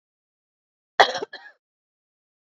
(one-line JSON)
{"cough_length": "2.6 s", "cough_amplitude": 27772, "cough_signal_mean_std_ratio": 0.17, "survey_phase": "beta (2021-08-13 to 2022-03-07)", "age": "45-64", "gender": "Female", "wearing_mask": "No", "symptom_cough_any": true, "symptom_runny_or_blocked_nose": true, "symptom_headache": true, "symptom_loss_of_taste": true, "symptom_other": true, "symptom_onset": "3 days", "smoker_status": "Ex-smoker", "respiratory_condition_asthma": false, "respiratory_condition_other": false, "recruitment_source": "Test and Trace", "submission_delay": "2 days", "covid_test_result": "Positive", "covid_test_method": "RT-qPCR", "covid_ct_value": 17.4, "covid_ct_gene": "ORF1ab gene", "covid_ct_mean": 18.2, "covid_viral_load": "1000000 copies/ml", "covid_viral_load_category": "High viral load (>1M copies/ml)"}